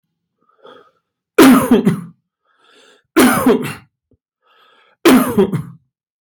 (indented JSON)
{
  "three_cough_length": "6.2 s",
  "three_cough_amplitude": 32767,
  "three_cough_signal_mean_std_ratio": 0.42,
  "survey_phase": "beta (2021-08-13 to 2022-03-07)",
  "age": "45-64",
  "gender": "Male",
  "wearing_mask": "No",
  "symptom_none": true,
  "smoker_status": "Ex-smoker",
  "respiratory_condition_asthma": false,
  "respiratory_condition_other": false,
  "recruitment_source": "REACT",
  "submission_delay": "6 days",
  "covid_test_result": "Negative",
  "covid_test_method": "RT-qPCR",
  "influenza_a_test_result": "Negative",
  "influenza_b_test_result": "Negative"
}